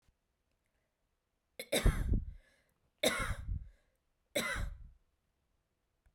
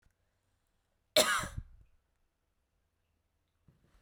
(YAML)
three_cough_length: 6.1 s
three_cough_amplitude: 5544
three_cough_signal_mean_std_ratio: 0.37
cough_length: 4.0 s
cough_amplitude: 9727
cough_signal_mean_std_ratio: 0.22
survey_phase: beta (2021-08-13 to 2022-03-07)
age: 18-44
gender: Female
wearing_mask: 'No'
symptom_none: true
smoker_status: Never smoked
respiratory_condition_asthma: false
respiratory_condition_other: false
recruitment_source: REACT
submission_delay: 1 day
covid_test_result: Negative
covid_test_method: RT-qPCR
influenza_a_test_result: Negative
influenza_b_test_result: Negative